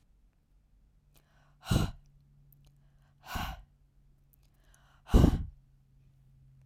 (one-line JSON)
{"exhalation_length": "6.7 s", "exhalation_amplitude": 12864, "exhalation_signal_mean_std_ratio": 0.24, "survey_phase": "alpha (2021-03-01 to 2021-08-12)", "age": "18-44", "gender": "Female", "wearing_mask": "No", "symptom_none": true, "smoker_status": "Never smoked", "respiratory_condition_asthma": false, "respiratory_condition_other": false, "recruitment_source": "REACT", "submission_delay": "1 day", "covid_test_result": "Negative", "covid_test_method": "RT-qPCR"}